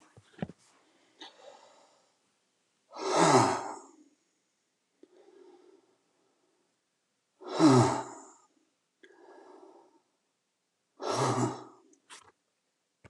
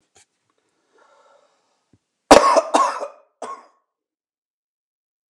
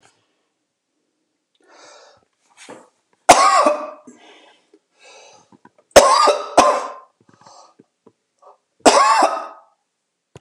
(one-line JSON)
{"exhalation_length": "13.1 s", "exhalation_amplitude": 11356, "exhalation_signal_mean_std_ratio": 0.29, "cough_length": "5.3 s", "cough_amplitude": 32768, "cough_signal_mean_std_ratio": 0.24, "three_cough_length": "10.4 s", "three_cough_amplitude": 32768, "three_cough_signal_mean_std_ratio": 0.33, "survey_phase": "beta (2021-08-13 to 2022-03-07)", "age": "65+", "gender": "Male", "wearing_mask": "No", "symptom_none": true, "smoker_status": "Ex-smoker", "respiratory_condition_asthma": false, "respiratory_condition_other": false, "recruitment_source": "REACT", "submission_delay": "2 days", "covid_test_result": "Negative", "covid_test_method": "RT-qPCR", "influenza_a_test_result": "Negative", "influenza_b_test_result": "Negative"}